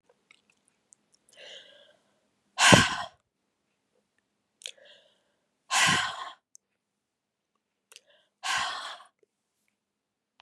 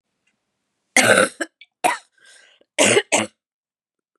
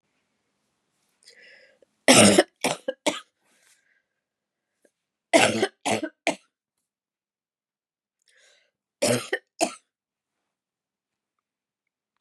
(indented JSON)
{
  "exhalation_length": "10.4 s",
  "exhalation_amplitude": 31964,
  "exhalation_signal_mean_std_ratio": 0.24,
  "cough_length": "4.2 s",
  "cough_amplitude": 32733,
  "cough_signal_mean_std_ratio": 0.35,
  "three_cough_length": "12.2 s",
  "three_cough_amplitude": 28989,
  "three_cough_signal_mean_std_ratio": 0.24,
  "survey_phase": "beta (2021-08-13 to 2022-03-07)",
  "age": "45-64",
  "gender": "Female",
  "wearing_mask": "No",
  "symptom_cough_any": true,
  "symptom_runny_or_blocked_nose": true,
  "symptom_fatigue": true,
  "symptom_change_to_sense_of_smell_or_taste": true,
  "symptom_loss_of_taste": true,
  "symptom_onset": "3 days",
  "smoker_status": "Never smoked",
  "respiratory_condition_asthma": false,
  "respiratory_condition_other": false,
  "recruitment_source": "Test and Trace",
  "submission_delay": "2 days",
  "covid_test_result": "Positive",
  "covid_test_method": "ePCR"
}